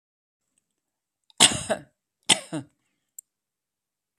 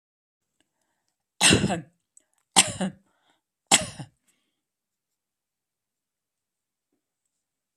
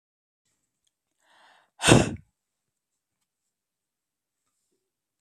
{"cough_length": "4.2 s", "cough_amplitude": 32768, "cough_signal_mean_std_ratio": 0.2, "three_cough_length": "7.8 s", "three_cough_amplitude": 29383, "three_cough_signal_mean_std_ratio": 0.22, "exhalation_length": "5.2 s", "exhalation_amplitude": 24574, "exhalation_signal_mean_std_ratio": 0.16, "survey_phase": "beta (2021-08-13 to 2022-03-07)", "age": "45-64", "gender": "Female", "wearing_mask": "No", "symptom_none": true, "symptom_onset": "2 days", "smoker_status": "Never smoked", "respiratory_condition_asthma": false, "respiratory_condition_other": false, "recruitment_source": "REACT", "submission_delay": "0 days", "covid_test_result": "Negative", "covid_test_method": "RT-qPCR", "influenza_a_test_result": "Negative", "influenza_b_test_result": "Negative"}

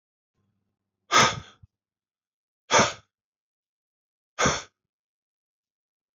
{"exhalation_length": "6.1 s", "exhalation_amplitude": 17396, "exhalation_signal_mean_std_ratio": 0.24, "survey_phase": "beta (2021-08-13 to 2022-03-07)", "age": "45-64", "gender": "Male", "wearing_mask": "No", "symptom_cough_any": true, "symptom_runny_or_blocked_nose": true, "smoker_status": "Prefer not to say", "respiratory_condition_asthma": false, "respiratory_condition_other": false, "recruitment_source": "REACT", "submission_delay": "1 day", "covid_test_result": "Negative", "covid_test_method": "RT-qPCR"}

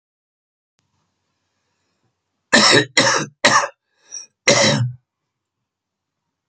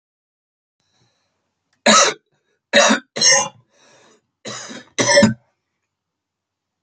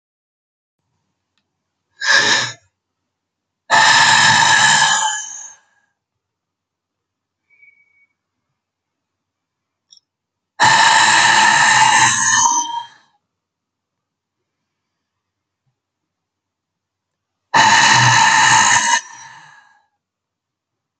{"cough_length": "6.5 s", "cough_amplitude": 31467, "cough_signal_mean_std_ratio": 0.35, "three_cough_length": "6.8 s", "three_cough_amplitude": 32767, "three_cough_signal_mean_std_ratio": 0.34, "exhalation_length": "21.0 s", "exhalation_amplitude": 32768, "exhalation_signal_mean_std_ratio": 0.44, "survey_phase": "beta (2021-08-13 to 2022-03-07)", "age": "45-64", "gender": "Male", "wearing_mask": "No", "symptom_none": true, "smoker_status": "Ex-smoker", "respiratory_condition_asthma": false, "respiratory_condition_other": false, "recruitment_source": "REACT", "submission_delay": "2 days", "covid_test_result": "Negative", "covid_test_method": "RT-qPCR", "influenza_a_test_result": "Negative", "influenza_b_test_result": "Negative"}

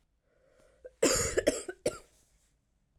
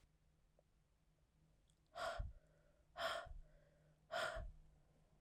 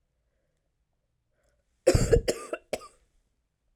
{"cough_length": "3.0 s", "cough_amplitude": 8848, "cough_signal_mean_std_ratio": 0.35, "exhalation_length": "5.2 s", "exhalation_amplitude": 947, "exhalation_signal_mean_std_ratio": 0.45, "three_cough_length": "3.8 s", "three_cough_amplitude": 15609, "three_cough_signal_mean_std_ratio": 0.27, "survey_phase": "alpha (2021-03-01 to 2021-08-12)", "age": "18-44", "gender": "Female", "wearing_mask": "No", "symptom_cough_any": true, "symptom_new_continuous_cough": true, "symptom_shortness_of_breath": true, "symptom_fatigue": true, "symptom_headache": true, "symptom_change_to_sense_of_smell_or_taste": true, "symptom_loss_of_taste": true, "symptom_onset": "7 days", "smoker_status": "Never smoked", "respiratory_condition_asthma": false, "respiratory_condition_other": false, "recruitment_source": "Test and Trace", "submission_delay": "2 days", "covid_test_result": "Positive", "covid_test_method": "RT-qPCR", "covid_ct_value": 13.8, "covid_ct_gene": "ORF1ab gene", "covid_ct_mean": 14.0, "covid_viral_load": "26000000 copies/ml", "covid_viral_load_category": "High viral load (>1M copies/ml)"}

